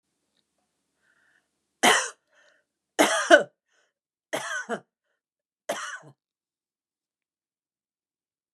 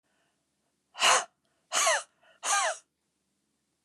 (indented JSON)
{
  "three_cough_length": "8.5 s",
  "three_cough_amplitude": 28900,
  "three_cough_signal_mean_std_ratio": 0.23,
  "exhalation_length": "3.8 s",
  "exhalation_amplitude": 10782,
  "exhalation_signal_mean_std_ratio": 0.37,
  "survey_phase": "beta (2021-08-13 to 2022-03-07)",
  "age": "45-64",
  "gender": "Female",
  "wearing_mask": "No",
  "symptom_runny_or_blocked_nose": true,
  "smoker_status": "Never smoked",
  "respiratory_condition_asthma": false,
  "respiratory_condition_other": false,
  "recruitment_source": "REACT",
  "submission_delay": "1 day",
  "covid_test_result": "Negative",
  "covid_test_method": "RT-qPCR",
  "influenza_a_test_result": "Negative",
  "influenza_b_test_result": "Negative"
}